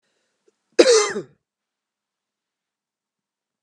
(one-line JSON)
{"cough_length": "3.6 s", "cough_amplitude": 32768, "cough_signal_mean_std_ratio": 0.23, "survey_phase": "beta (2021-08-13 to 2022-03-07)", "age": "45-64", "gender": "Female", "wearing_mask": "No", "symptom_runny_or_blocked_nose": true, "symptom_fatigue": true, "symptom_change_to_sense_of_smell_or_taste": true, "symptom_onset": "6 days", "smoker_status": "Never smoked", "respiratory_condition_asthma": false, "respiratory_condition_other": false, "recruitment_source": "REACT", "submission_delay": "1 day", "covid_test_result": "Positive", "covid_test_method": "RT-qPCR", "covid_ct_value": 35.0, "covid_ct_gene": "N gene", "influenza_a_test_result": "Negative", "influenza_b_test_result": "Negative"}